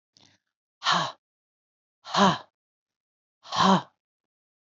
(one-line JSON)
{"exhalation_length": "4.6 s", "exhalation_amplitude": 13893, "exhalation_signal_mean_std_ratio": 0.32, "survey_phase": "alpha (2021-03-01 to 2021-08-12)", "age": "45-64", "gender": "Female", "wearing_mask": "No", "symptom_none": true, "smoker_status": "Never smoked", "respiratory_condition_asthma": false, "respiratory_condition_other": false, "recruitment_source": "REACT", "submission_delay": "2 days", "covid_test_result": "Negative", "covid_test_method": "RT-qPCR"}